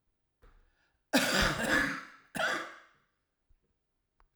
{"cough_length": "4.4 s", "cough_amplitude": 6836, "cough_signal_mean_std_ratio": 0.42, "survey_phase": "alpha (2021-03-01 to 2021-08-12)", "age": "65+", "gender": "Male", "wearing_mask": "No", "symptom_cough_any": true, "symptom_fatigue": true, "symptom_change_to_sense_of_smell_or_taste": true, "symptom_loss_of_taste": true, "symptom_onset": "5 days", "smoker_status": "Ex-smoker", "respiratory_condition_asthma": false, "respiratory_condition_other": false, "recruitment_source": "Test and Trace", "submission_delay": "1 day", "covid_test_result": "Positive", "covid_test_method": "RT-qPCR"}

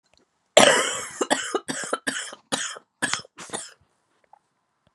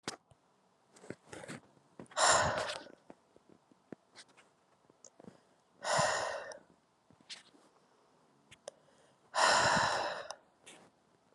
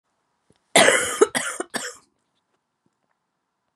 {"three_cough_length": "4.9 s", "three_cough_amplitude": 32767, "three_cough_signal_mean_std_ratio": 0.36, "exhalation_length": "11.3 s", "exhalation_amplitude": 6412, "exhalation_signal_mean_std_ratio": 0.37, "cough_length": "3.8 s", "cough_amplitude": 28212, "cough_signal_mean_std_ratio": 0.31, "survey_phase": "beta (2021-08-13 to 2022-03-07)", "age": "18-44", "gender": "Female", "wearing_mask": "No", "symptom_cough_any": true, "symptom_runny_or_blocked_nose": true, "symptom_shortness_of_breath": true, "symptom_diarrhoea": true, "symptom_fatigue": true, "symptom_headache": true, "symptom_change_to_sense_of_smell_or_taste": true, "symptom_loss_of_taste": true, "symptom_onset": "5 days", "smoker_status": "Never smoked", "respiratory_condition_asthma": false, "respiratory_condition_other": false, "recruitment_source": "Test and Trace", "submission_delay": "2 days", "covid_test_result": "Positive", "covid_test_method": "RT-qPCR", "covid_ct_value": 14.5, "covid_ct_gene": "ORF1ab gene", "covid_ct_mean": 14.9, "covid_viral_load": "13000000 copies/ml", "covid_viral_load_category": "High viral load (>1M copies/ml)"}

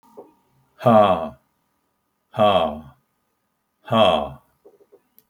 {"exhalation_length": "5.3 s", "exhalation_amplitude": 25322, "exhalation_signal_mean_std_ratio": 0.37, "survey_phase": "alpha (2021-03-01 to 2021-08-12)", "age": "65+", "gender": "Male", "wearing_mask": "No", "symptom_none": true, "smoker_status": "Ex-smoker", "respiratory_condition_asthma": false, "respiratory_condition_other": false, "recruitment_source": "REACT", "submission_delay": "1 day", "covid_test_result": "Negative", "covid_test_method": "RT-qPCR"}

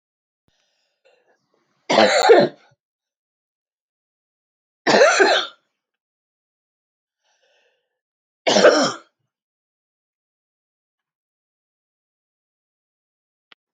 {"three_cough_length": "13.7 s", "three_cough_amplitude": 27052, "three_cough_signal_mean_std_ratio": 0.27, "survey_phase": "alpha (2021-03-01 to 2021-08-12)", "age": "65+", "gender": "Female", "wearing_mask": "No", "symptom_none": true, "smoker_status": "Never smoked", "respiratory_condition_asthma": false, "respiratory_condition_other": false, "recruitment_source": "REACT", "submission_delay": "3 days", "covid_test_result": "Negative", "covid_test_method": "RT-qPCR"}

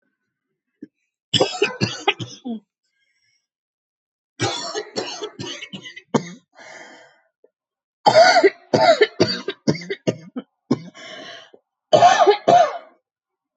{"three_cough_length": "13.6 s", "three_cough_amplitude": 28106, "three_cough_signal_mean_std_ratio": 0.37, "survey_phase": "beta (2021-08-13 to 2022-03-07)", "age": "18-44", "gender": "Female", "wearing_mask": "No", "symptom_cough_any": true, "symptom_shortness_of_breath": true, "symptom_change_to_sense_of_smell_or_taste": true, "smoker_status": "Never smoked", "respiratory_condition_asthma": false, "respiratory_condition_other": false, "recruitment_source": "REACT", "submission_delay": "1 day", "covid_test_result": "Negative", "covid_test_method": "RT-qPCR", "influenza_a_test_result": "Negative", "influenza_b_test_result": "Negative"}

